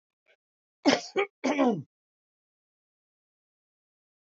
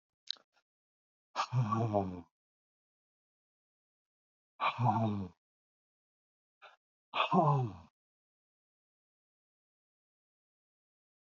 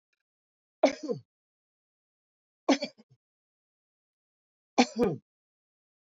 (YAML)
cough_length: 4.4 s
cough_amplitude: 13355
cough_signal_mean_std_ratio: 0.28
exhalation_length: 11.3 s
exhalation_amplitude: 5801
exhalation_signal_mean_std_ratio: 0.32
three_cough_length: 6.1 s
three_cough_amplitude: 14998
three_cough_signal_mean_std_ratio: 0.22
survey_phase: beta (2021-08-13 to 2022-03-07)
age: 65+
gender: Male
wearing_mask: 'No'
symptom_other: true
smoker_status: Ex-smoker
respiratory_condition_asthma: false
respiratory_condition_other: true
recruitment_source: REACT
submission_delay: 1 day
covid_test_result: Negative
covid_test_method: RT-qPCR
influenza_a_test_result: Negative
influenza_b_test_result: Negative